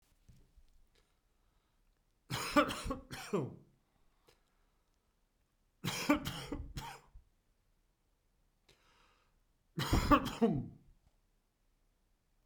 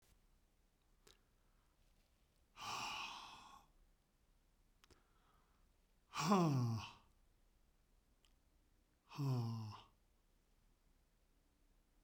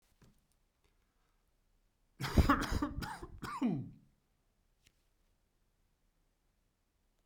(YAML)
three_cough_length: 12.5 s
three_cough_amplitude: 6819
three_cough_signal_mean_std_ratio: 0.31
exhalation_length: 12.0 s
exhalation_amplitude: 2403
exhalation_signal_mean_std_ratio: 0.33
cough_length: 7.3 s
cough_amplitude: 6025
cough_signal_mean_std_ratio: 0.3
survey_phase: beta (2021-08-13 to 2022-03-07)
age: 45-64
gender: Male
wearing_mask: 'No'
symptom_cough_any: true
smoker_status: Never smoked
respiratory_condition_asthma: false
respiratory_condition_other: false
recruitment_source: Test and Trace
submission_delay: 2 days
covid_test_result: Positive
covid_test_method: RT-qPCR